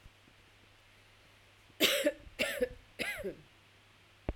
three_cough_length: 4.4 s
three_cough_amplitude: 6866
three_cough_signal_mean_std_ratio: 0.39
survey_phase: beta (2021-08-13 to 2022-03-07)
age: 45-64
gender: Female
wearing_mask: 'No'
symptom_none: true
smoker_status: Ex-smoker
respiratory_condition_asthma: false
respiratory_condition_other: false
recruitment_source: REACT
submission_delay: 1 day
covid_test_result: Negative
covid_test_method: RT-qPCR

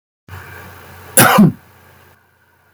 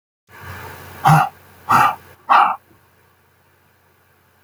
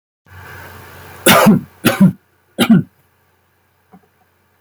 cough_length: 2.7 s
cough_amplitude: 32768
cough_signal_mean_std_ratio: 0.34
exhalation_length: 4.4 s
exhalation_amplitude: 29641
exhalation_signal_mean_std_ratio: 0.36
three_cough_length: 4.6 s
three_cough_amplitude: 32768
three_cough_signal_mean_std_ratio: 0.37
survey_phase: beta (2021-08-13 to 2022-03-07)
age: 45-64
gender: Male
wearing_mask: 'No'
symptom_cough_any: true
symptom_new_continuous_cough: true
symptom_runny_or_blocked_nose: true
symptom_sore_throat: true
symptom_abdominal_pain: true
symptom_diarrhoea: true
symptom_fatigue: true
symptom_onset: 11 days
smoker_status: Ex-smoker
respiratory_condition_asthma: false
respiratory_condition_other: false
recruitment_source: REACT
submission_delay: 1 day
covid_test_result: Negative
covid_test_method: RT-qPCR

